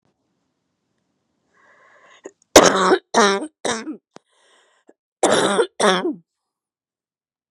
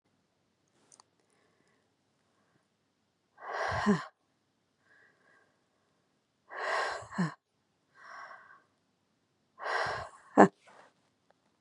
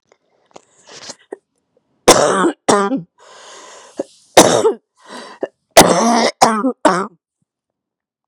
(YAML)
cough_length: 7.5 s
cough_amplitude: 32768
cough_signal_mean_std_ratio: 0.33
exhalation_length: 11.6 s
exhalation_amplitude: 24399
exhalation_signal_mean_std_ratio: 0.24
three_cough_length: 8.3 s
three_cough_amplitude: 32768
three_cough_signal_mean_std_ratio: 0.39
survey_phase: beta (2021-08-13 to 2022-03-07)
age: 45-64
gender: Female
wearing_mask: 'No'
symptom_fatigue: true
symptom_headache: true
symptom_onset: 12 days
smoker_status: Ex-smoker
respiratory_condition_asthma: false
respiratory_condition_other: false
recruitment_source: REACT
submission_delay: 3 days
covid_test_result: Negative
covid_test_method: RT-qPCR
influenza_a_test_result: Negative
influenza_b_test_result: Negative